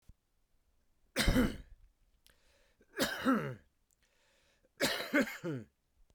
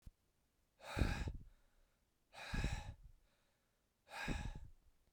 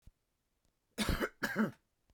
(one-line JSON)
{"three_cough_length": "6.1 s", "three_cough_amplitude": 5525, "three_cough_signal_mean_std_ratio": 0.39, "exhalation_length": "5.1 s", "exhalation_amplitude": 2571, "exhalation_signal_mean_std_ratio": 0.44, "cough_length": "2.1 s", "cough_amplitude": 3220, "cough_signal_mean_std_ratio": 0.41, "survey_phase": "beta (2021-08-13 to 2022-03-07)", "age": "18-44", "gender": "Male", "wearing_mask": "No", "symptom_runny_or_blocked_nose": true, "symptom_fatigue": true, "symptom_headache": true, "symptom_onset": "3 days", "smoker_status": "Never smoked", "respiratory_condition_asthma": false, "respiratory_condition_other": false, "recruitment_source": "Test and Trace", "submission_delay": "2 days", "covid_test_result": "Positive", "covid_test_method": "RT-qPCR", "covid_ct_value": 17.5, "covid_ct_gene": "N gene", "covid_ct_mean": 18.8, "covid_viral_load": "690000 copies/ml", "covid_viral_load_category": "Low viral load (10K-1M copies/ml)"}